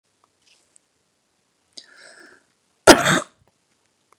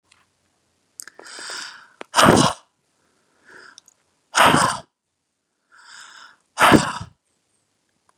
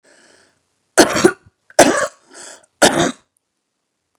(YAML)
cough_length: 4.2 s
cough_amplitude: 32768
cough_signal_mean_std_ratio: 0.18
exhalation_length: 8.2 s
exhalation_amplitude: 32767
exhalation_signal_mean_std_ratio: 0.29
three_cough_length: 4.2 s
three_cough_amplitude: 32768
three_cough_signal_mean_std_ratio: 0.32
survey_phase: beta (2021-08-13 to 2022-03-07)
age: 45-64
gender: Female
wearing_mask: 'No'
symptom_headache: true
symptom_onset: 8 days
smoker_status: Ex-smoker
respiratory_condition_asthma: true
respiratory_condition_other: false
recruitment_source: REACT
submission_delay: 2 days
covid_test_result: Negative
covid_test_method: RT-qPCR
influenza_a_test_result: Negative
influenza_b_test_result: Negative